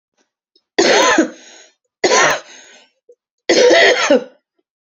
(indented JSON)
{
  "three_cough_length": "4.9 s",
  "three_cough_amplitude": 32570,
  "three_cough_signal_mean_std_ratio": 0.49,
  "survey_phase": "beta (2021-08-13 to 2022-03-07)",
  "age": "18-44",
  "gender": "Female",
  "wearing_mask": "No",
  "symptom_cough_any": true,
  "symptom_runny_or_blocked_nose": true,
  "symptom_sore_throat": true,
  "symptom_fatigue": true,
  "symptom_headache": true,
  "symptom_onset": "2 days",
  "smoker_status": "Never smoked",
  "respiratory_condition_asthma": false,
  "respiratory_condition_other": false,
  "recruitment_source": "Test and Trace",
  "submission_delay": "2 days",
  "covid_test_result": "Positive",
  "covid_test_method": "RT-qPCR",
  "covid_ct_value": 22.3,
  "covid_ct_gene": "ORF1ab gene"
}